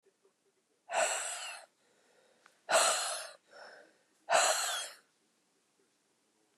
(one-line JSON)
{"exhalation_length": "6.6 s", "exhalation_amplitude": 6483, "exhalation_signal_mean_std_ratio": 0.4, "survey_phase": "beta (2021-08-13 to 2022-03-07)", "age": "45-64", "gender": "Female", "wearing_mask": "No", "symptom_cough_any": true, "symptom_runny_or_blocked_nose": true, "symptom_sore_throat": true, "symptom_diarrhoea": true, "symptom_fatigue": true, "symptom_headache": true, "symptom_change_to_sense_of_smell_or_taste": true, "symptom_loss_of_taste": true, "smoker_status": "Ex-smoker", "respiratory_condition_asthma": false, "respiratory_condition_other": false, "recruitment_source": "Test and Trace", "submission_delay": "2 days", "covid_test_result": "Positive", "covid_test_method": "RT-qPCR", "covid_ct_value": 18.4, "covid_ct_gene": "ORF1ab gene", "covid_ct_mean": 18.8, "covid_viral_load": "660000 copies/ml", "covid_viral_load_category": "Low viral load (10K-1M copies/ml)"}